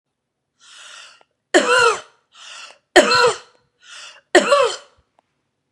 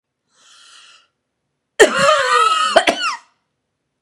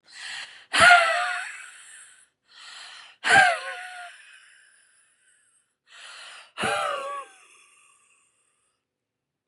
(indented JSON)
{
  "three_cough_length": "5.7 s",
  "three_cough_amplitude": 32768,
  "three_cough_signal_mean_std_ratio": 0.37,
  "cough_length": "4.0 s",
  "cough_amplitude": 32768,
  "cough_signal_mean_std_ratio": 0.44,
  "exhalation_length": "9.5 s",
  "exhalation_amplitude": 28008,
  "exhalation_signal_mean_std_ratio": 0.33,
  "survey_phase": "beta (2021-08-13 to 2022-03-07)",
  "age": "18-44",
  "gender": "Female",
  "wearing_mask": "No",
  "symptom_none": true,
  "smoker_status": "Ex-smoker",
  "respiratory_condition_asthma": false,
  "respiratory_condition_other": false,
  "recruitment_source": "REACT",
  "submission_delay": "1 day",
  "covid_test_result": "Negative",
  "covid_test_method": "RT-qPCR",
  "influenza_a_test_result": "Negative",
  "influenza_b_test_result": "Negative"
}